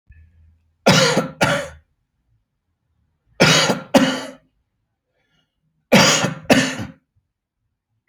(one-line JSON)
{"three_cough_length": "8.1 s", "three_cough_amplitude": 32768, "three_cough_signal_mean_std_ratio": 0.39, "survey_phase": "alpha (2021-03-01 to 2021-08-12)", "age": "45-64", "gender": "Male", "wearing_mask": "No", "symptom_shortness_of_breath": true, "symptom_fatigue": true, "symptom_onset": "12 days", "smoker_status": "Ex-smoker", "respiratory_condition_asthma": false, "respiratory_condition_other": false, "recruitment_source": "REACT", "submission_delay": "2 days", "covid_test_result": "Negative", "covid_test_method": "RT-qPCR"}